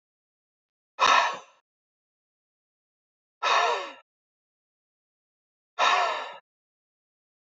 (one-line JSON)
{"exhalation_length": "7.6 s", "exhalation_amplitude": 14641, "exhalation_signal_mean_std_ratio": 0.32, "survey_phase": "beta (2021-08-13 to 2022-03-07)", "age": "65+", "gender": "Male", "wearing_mask": "No", "symptom_other": true, "symptom_onset": "8 days", "smoker_status": "Never smoked", "respiratory_condition_asthma": false, "respiratory_condition_other": false, "recruitment_source": "REACT", "submission_delay": "1 day", "covid_test_result": "Negative", "covid_test_method": "RT-qPCR", "influenza_a_test_result": "Negative", "influenza_b_test_result": "Negative"}